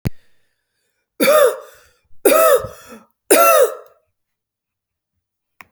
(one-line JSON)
{"three_cough_length": "5.7 s", "three_cough_amplitude": 32768, "three_cough_signal_mean_std_ratio": 0.4, "survey_phase": "alpha (2021-03-01 to 2021-08-12)", "age": "18-44", "gender": "Female", "wearing_mask": "No", "symptom_none": true, "smoker_status": "Never smoked", "respiratory_condition_asthma": false, "respiratory_condition_other": false, "recruitment_source": "REACT", "submission_delay": "1 day", "covid_test_result": "Negative", "covid_test_method": "RT-qPCR"}